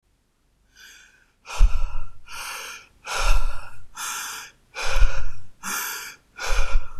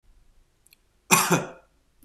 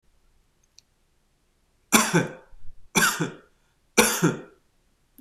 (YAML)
exhalation_length: 7.0 s
exhalation_amplitude: 25886
exhalation_signal_mean_std_ratio: 0.56
cough_length: 2.0 s
cough_amplitude: 26027
cough_signal_mean_std_ratio: 0.31
three_cough_length: 5.2 s
three_cough_amplitude: 26028
three_cough_signal_mean_std_ratio: 0.36
survey_phase: beta (2021-08-13 to 2022-03-07)
age: 18-44
gender: Male
wearing_mask: 'No'
symptom_none: true
smoker_status: Never smoked
respiratory_condition_asthma: false
respiratory_condition_other: false
recruitment_source: REACT
submission_delay: 1 day
covid_test_result: Negative
covid_test_method: RT-qPCR
influenza_a_test_result: Negative
influenza_b_test_result: Negative